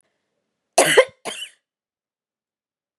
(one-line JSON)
{"cough_length": "3.0 s", "cough_amplitude": 32685, "cough_signal_mean_std_ratio": 0.24, "survey_phase": "beta (2021-08-13 to 2022-03-07)", "age": "45-64", "gender": "Female", "wearing_mask": "No", "symptom_none": true, "symptom_onset": "5 days", "smoker_status": "Never smoked", "respiratory_condition_asthma": false, "respiratory_condition_other": false, "recruitment_source": "REACT", "submission_delay": "1 day", "covid_test_result": "Negative", "covid_test_method": "RT-qPCR", "influenza_a_test_result": "Negative", "influenza_b_test_result": "Negative"}